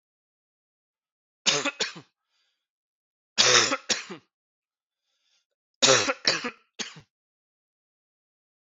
three_cough_length: 8.8 s
three_cough_amplitude: 20434
three_cough_signal_mean_std_ratio: 0.29
survey_phase: beta (2021-08-13 to 2022-03-07)
age: 45-64
gender: Male
wearing_mask: 'No'
symptom_new_continuous_cough: true
symptom_runny_or_blocked_nose: true
symptom_fatigue: true
symptom_change_to_sense_of_smell_or_taste: true
symptom_onset: 3 days
smoker_status: Ex-smoker
respiratory_condition_asthma: false
respiratory_condition_other: false
recruitment_source: Test and Trace
submission_delay: 1 day
covid_test_result: Positive
covid_test_method: RT-qPCR
covid_ct_value: 16.4
covid_ct_gene: ORF1ab gene
covid_ct_mean: 17.6
covid_viral_load: 1700000 copies/ml
covid_viral_load_category: High viral load (>1M copies/ml)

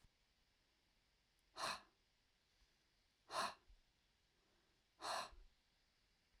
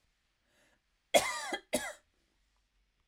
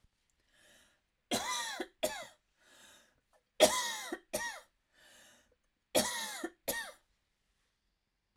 exhalation_length: 6.4 s
exhalation_amplitude: 852
exhalation_signal_mean_std_ratio: 0.31
cough_length: 3.1 s
cough_amplitude: 9991
cough_signal_mean_std_ratio: 0.27
three_cough_length: 8.4 s
three_cough_amplitude: 10397
three_cough_signal_mean_std_ratio: 0.34
survey_phase: alpha (2021-03-01 to 2021-08-12)
age: 45-64
gender: Female
wearing_mask: 'No'
symptom_shortness_of_breath: true
symptom_onset: 12 days
smoker_status: Never smoked
respiratory_condition_asthma: true
respiratory_condition_other: false
recruitment_source: REACT
submission_delay: 2 days
covid_test_result: Negative
covid_test_method: RT-qPCR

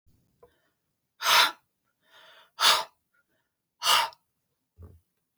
exhalation_length: 5.4 s
exhalation_amplitude: 17034
exhalation_signal_mean_std_ratio: 0.3
survey_phase: beta (2021-08-13 to 2022-03-07)
age: 45-64
gender: Female
wearing_mask: 'No'
symptom_cough_any: true
symptom_runny_or_blocked_nose: true
symptom_sore_throat: true
symptom_headache: true
symptom_other: true
symptom_onset: 3 days
smoker_status: Never smoked
respiratory_condition_asthma: false
respiratory_condition_other: false
recruitment_source: Test and Trace
submission_delay: 1 day
covid_test_result: Positive
covid_test_method: RT-qPCR
covid_ct_value: 17.3
covid_ct_gene: ORF1ab gene
covid_ct_mean: 17.7
covid_viral_load: 1500000 copies/ml
covid_viral_load_category: High viral load (>1M copies/ml)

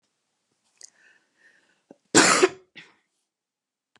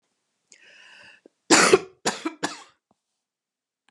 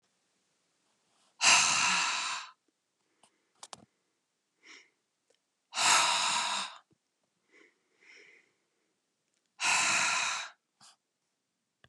cough_length: 4.0 s
cough_amplitude: 26123
cough_signal_mean_std_ratio: 0.23
three_cough_length: 3.9 s
three_cough_amplitude: 29248
three_cough_signal_mean_std_ratio: 0.26
exhalation_length: 11.9 s
exhalation_amplitude: 11212
exhalation_signal_mean_std_ratio: 0.39
survey_phase: beta (2021-08-13 to 2022-03-07)
age: 45-64
gender: Female
wearing_mask: 'No'
symptom_cough_any: true
symptom_runny_or_blocked_nose: true
symptom_other: true
smoker_status: Ex-smoker
respiratory_condition_asthma: false
respiratory_condition_other: false
recruitment_source: Test and Trace
submission_delay: 2 days
covid_test_result: Positive
covid_test_method: RT-qPCR
covid_ct_value: 23.6
covid_ct_gene: ORF1ab gene
covid_ct_mean: 24.0
covid_viral_load: 14000 copies/ml
covid_viral_load_category: Low viral load (10K-1M copies/ml)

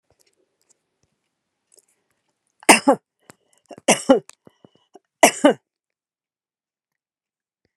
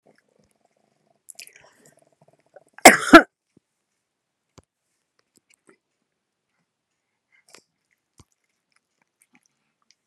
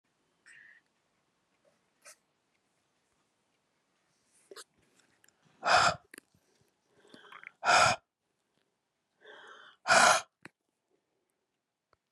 three_cough_length: 7.8 s
three_cough_amplitude: 32768
three_cough_signal_mean_std_ratio: 0.2
cough_length: 10.1 s
cough_amplitude: 32768
cough_signal_mean_std_ratio: 0.11
exhalation_length: 12.1 s
exhalation_amplitude: 11659
exhalation_signal_mean_std_ratio: 0.23
survey_phase: beta (2021-08-13 to 2022-03-07)
age: 65+
gender: Female
wearing_mask: 'No'
symptom_fatigue: true
smoker_status: Never smoked
respiratory_condition_asthma: true
respiratory_condition_other: false
recruitment_source: REACT
submission_delay: 9 days
covid_test_result: Negative
covid_test_method: RT-qPCR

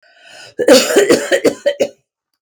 cough_length: 2.4 s
cough_amplitude: 32768
cough_signal_mean_std_ratio: 0.52
survey_phase: beta (2021-08-13 to 2022-03-07)
age: 45-64
gender: Female
wearing_mask: 'No'
symptom_none: true
smoker_status: Ex-smoker
respiratory_condition_asthma: true
respiratory_condition_other: false
recruitment_source: REACT
submission_delay: 1 day
covid_test_result: Negative
covid_test_method: RT-qPCR
influenza_a_test_result: Negative
influenza_b_test_result: Negative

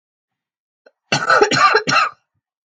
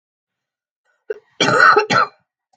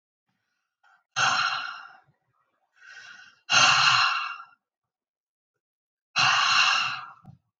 three_cough_length: 2.6 s
three_cough_amplitude: 32766
three_cough_signal_mean_std_ratio: 0.47
cough_length: 2.6 s
cough_amplitude: 32768
cough_signal_mean_std_ratio: 0.4
exhalation_length: 7.6 s
exhalation_amplitude: 16484
exhalation_signal_mean_std_ratio: 0.45
survey_phase: beta (2021-08-13 to 2022-03-07)
age: 45-64
gender: Female
wearing_mask: 'No'
symptom_none: true
symptom_onset: 12 days
smoker_status: Never smoked
respiratory_condition_asthma: true
respiratory_condition_other: false
recruitment_source: REACT
submission_delay: 2 days
covid_test_result: Positive
covid_test_method: RT-qPCR
covid_ct_value: 30.0
covid_ct_gene: N gene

